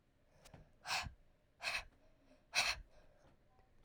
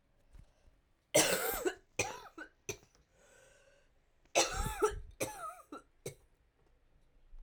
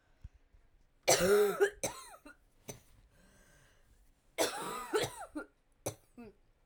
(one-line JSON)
{"exhalation_length": "3.8 s", "exhalation_amplitude": 2525, "exhalation_signal_mean_std_ratio": 0.38, "cough_length": "7.4 s", "cough_amplitude": 6863, "cough_signal_mean_std_ratio": 0.37, "three_cough_length": "6.7 s", "three_cough_amplitude": 7741, "three_cough_signal_mean_std_ratio": 0.38, "survey_phase": "alpha (2021-03-01 to 2021-08-12)", "age": "18-44", "gender": "Female", "wearing_mask": "No", "symptom_cough_any": true, "symptom_new_continuous_cough": true, "symptom_shortness_of_breath": true, "symptom_fever_high_temperature": true, "symptom_headache": true, "symptom_change_to_sense_of_smell_or_taste": true, "symptom_loss_of_taste": true, "symptom_onset": "2 days", "smoker_status": "Ex-smoker", "respiratory_condition_asthma": false, "respiratory_condition_other": false, "recruitment_source": "Test and Trace", "submission_delay": "1 day", "covid_test_result": "Positive", "covid_test_method": "RT-qPCR", "covid_ct_value": 17.9, "covid_ct_gene": "ORF1ab gene"}